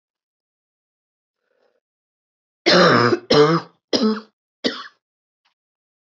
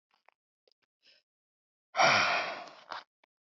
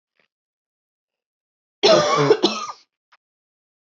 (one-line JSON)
{"three_cough_length": "6.1 s", "three_cough_amplitude": 25252, "three_cough_signal_mean_std_ratio": 0.35, "exhalation_length": "3.6 s", "exhalation_amplitude": 9303, "exhalation_signal_mean_std_ratio": 0.33, "cough_length": "3.8 s", "cough_amplitude": 24403, "cough_signal_mean_std_ratio": 0.34, "survey_phase": "beta (2021-08-13 to 2022-03-07)", "age": "18-44", "gender": "Female", "wearing_mask": "No", "symptom_cough_any": true, "symptom_runny_or_blocked_nose": true, "symptom_shortness_of_breath": true, "symptom_sore_throat": true, "symptom_fatigue": true, "symptom_headache": true, "smoker_status": "Prefer not to say", "recruitment_source": "Test and Trace", "submission_delay": "1 day", "covid_test_result": "Positive", "covid_test_method": "LFT"}